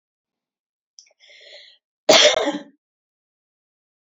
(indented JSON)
{
  "cough_length": "4.2 s",
  "cough_amplitude": 31245,
  "cough_signal_mean_std_ratio": 0.25,
  "survey_phase": "beta (2021-08-13 to 2022-03-07)",
  "age": "18-44",
  "gender": "Female",
  "wearing_mask": "No",
  "symptom_runny_or_blocked_nose": true,
  "symptom_other": true,
  "smoker_status": "Never smoked",
  "respiratory_condition_asthma": false,
  "respiratory_condition_other": false,
  "recruitment_source": "Test and Trace",
  "submission_delay": "2 days",
  "covid_test_result": "Positive",
  "covid_test_method": "RT-qPCR",
  "covid_ct_value": 13.7,
  "covid_ct_gene": "N gene",
  "covid_ct_mean": 14.5,
  "covid_viral_load": "18000000 copies/ml",
  "covid_viral_load_category": "High viral load (>1M copies/ml)"
}